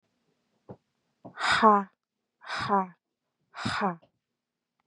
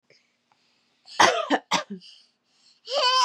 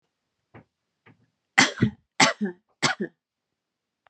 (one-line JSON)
{"exhalation_length": "4.9 s", "exhalation_amplitude": 18274, "exhalation_signal_mean_std_ratio": 0.33, "cough_length": "3.2 s", "cough_amplitude": 25978, "cough_signal_mean_std_ratio": 0.41, "three_cough_length": "4.1 s", "three_cough_amplitude": 31743, "three_cough_signal_mean_std_ratio": 0.28, "survey_phase": "beta (2021-08-13 to 2022-03-07)", "age": "18-44", "gender": "Female", "wearing_mask": "No", "symptom_runny_or_blocked_nose": true, "symptom_sore_throat": true, "smoker_status": "Ex-smoker", "respiratory_condition_asthma": true, "respiratory_condition_other": false, "recruitment_source": "REACT", "submission_delay": "2 days", "covid_test_result": "Negative", "covid_test_method": "RT-qPCR", "influenza_a_test_result": "Negative", "influenza_b_test_result": "Negative"}